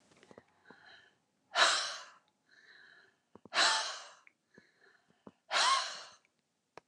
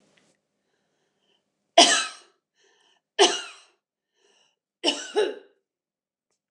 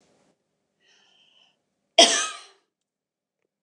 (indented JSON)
{
  "exhalation_length": "6.9 s",
  "exhalation_amplitude": 7516,
  "exhalation_signal_mean_std_ratio": 0.35,
  "three_cough_length": "6.5 s",
  "three_cough_amplitude": 26838,
  "three_cough_signal_mean_std_ratio": 0.25,
  "cough_length": "3.6 s",
  "cough_amplitude": 27287,
  "cough_signal_mean_std_ratio": 0.2,
  "survey_phase": "beta (2021-08-13 to 2022-03-07)",
  "age": "45-64",
  "gender": "Female",
  "wearing_mask": "No",
  "symptom_none": true,
  "smoker_status": "Ex-smoker",
  "respiratory_condition_asthma": false,
  "respiratory_condition_other": false,
  "recruitment_source": "REACT",
  "submission_delay": "2 days",
  "covid_test_result": "Negative",
  "covid_test_method": "RT-qPCR",
  "influenza_a_test_result": "Negative",
  "influenza_b_test_result": "Negative"
}